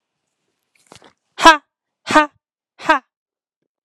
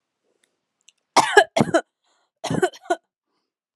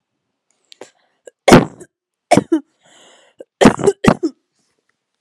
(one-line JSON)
{"exhalation_length": "3.8 s", "exhalation_amplitude": 32768, "exhalation_signal_mean_std_ratio": 0.23, "cough_length": "3.8 s", "cough_amplitude": 32757, "cough_signal_mean_std_ratio": 0.29, "three_cough_length": "5.2 s", "three_cough_amplitude": 32768, "three_cough_signal_mean_std_ratio": 0.28, "survey_phase": "alpha (2021-03-01 to 2021-08-12)", "age": "18-44", "gender": "Female", "wearing_mask": "No", "symptom_none": true, "smoker_status": "Never smoked", "respiratory_condition_asthma": true, "respiratory_condition_other": false, "recruitment_source": "REACT", "submission_delay": "3 days", "covid_test_result": "Negative", "covid_test_method": "RT-qPCR"}